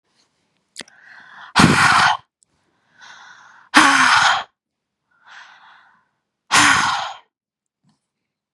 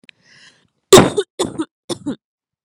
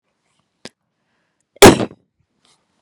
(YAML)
exhalation_length: 8.5 s
exhalation_amplitude: 32768
exhalation_signal_mean_std_ratio: 0.39
three_cough_length: 2.6 s
three_cough_amplitude: 32768
three_cough_signal_mean_std_ratio: 0.28
cough_length: 2.8 s
cough_amplitude: 32768
cough_signal_mean_std_ratio: 0.2
survey_phase: beta (2021-08-13 to 2022-03-07)
age: 18-44
gender: Female
wearing_mask: 'No'
symptom_cough_any: true
symptom_new_continuous_cough: true
symptom_runny_or_blocked_nose: true
symptom_sore_throat: true
symptom_headache: true
smoker_status: Never smoked
respiratory_condition_asthma: false
respiratory_condition_other: false
recruitment_source: Test and Trace
submission_delay: 1 day
covid_test_result: Positive
covid_test_method: RT-qPCR